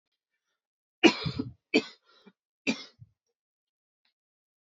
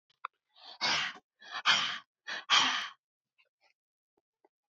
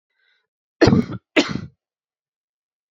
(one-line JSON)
{"three_cough_length": "4.6 s", "three_cough_amplitude": 18486, "three_cough_signal_mean_std_ratio": 0.21, "exhalation_length": "4.7 s", "exhalation_amplitude": 7844, "exhalation_signal_mean_std_ratio": 0.38, "cough_length": "2.9 s", "cough_amplitude": 27244, "cough_signal_mean_std_ratio": 0.28, "survey_phase": "beta (2021-08-13 to 2022-03-07)", "age": "18-44", "gender": "Female", "wearing_mask": "No", "symptom_cough_any": true, "symptom_runny_or_blocked_nose": true, "symptom_fatigue": true, "symptom_change_to_sense_of_smell_or_taste": true, "symptom_loss_of_taste": true, "smoker_status": "Never smoked", "respiratory_condition_asthma": true, "respiratory_condition_other": false, "recruitment_source": "Test and Trace", "submission_delay": "2 days", "covid_test_result": "Positive", "covid_test_method": "RT-qPCR", "covid_ct_value": 14.5, "covid_ct_gene": "ORF1ab gene", "covid_ct_mean": 15.0, "covid_viral_load": "12000000 copies/ml", "covid_viral_load_category": "High viral load (>1M copies/ml)"}